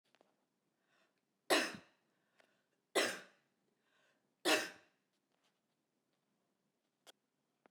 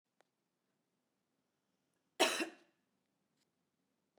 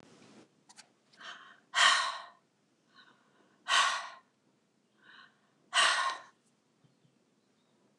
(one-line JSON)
{"three_cough_length": "7.7 s", "three_cough_amplitude": 4129, "three_cough_signal_mean_std_ratio": 0.23, "cough_length": "4.2 s", "cough_amplitude": 4708, "cough_signal_mean_std_ratio": 0.19, "exhalation_length": "8.0 s", "exhalation_amplitude": 9710, "exhalation_signal_mean_std_ratio": 0.32, "survey_phase": "beta (2021-08-13 to 2022-03-07)", "age": "45-64", "gender": "Female", "wearing_mask": "No", "symptom_cough_any": true, "symptom_runny_or_blocked_nose": true, "symptom_onset": "12 days", "smoker_status": "Never smoked", "respiratory_condition_asthma": true, "respiratory_condition_other": false, "recruitment_source": "REACT", "submission_delay": "2 days", "covid_test_result": "Negative", "covid_test_method": "RT-qPCR"}